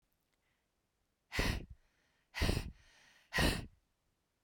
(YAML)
exhalation_length: 4.4 s
exhalation_amplitude: 3730
exhalation_signal_mean_std_ratio: 0.36
survey_phase: beta (2021-08-13 to 2022-03-07)
age: 45-64
gender: Female
wearing_mask: 'No'
symptom_none: true
smoker_status: Never smoked
respiratory_condition_asthma: false
respiratory_condition_other: false
recruitment_source: REACT
submission_delay: 1 day
covid_test_result: Negative
covid_test_method: RT-qPCR